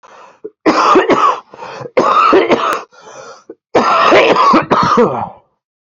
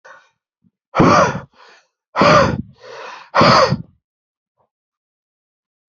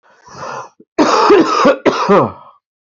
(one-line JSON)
{"three_cough_length": "6.0 s", "three_cough_amplitude": 32768, "three_cough_signal_mean_std_ratio": 0.68, "exhalation_length": "5.9 s", "exhalation_amplitude": 32767, "exhalation_signal_mean_std_ratio": 0.39, "cough_length": "2.8 s", "cough_amplitude": 28934, "cough_signal_mean_std_ratio": 0.61, "survey_phase": "beta (2021-08-13 to 2022-03-07)", "age": "18-44", "gender": "Male", "wearing_mask": "No", "symptom_cough_any": true, "symptom_runny_or_blocked_nose": true, "symptom_shortness_of_breath": true, "symptom_fatigue": true, "symptom_headache": true, "symptom_change_to_sense_of_smell_or_taste": true, "symptom_loss_of_taste": true, "symptom_onset": "3 days", "smoker_status": "Ex-smoker", "respiratory_condition_asthma": false, "respiratory_condition_other": false, "recruitment_source": "Test and Trace", "submission_delay": "2 days", "covid_test_result": "Positive", "covid_test_method": "RT-qPCR", "covid_ct_value": 18.1, "covid_ct_gene": "ORF1ab gene"}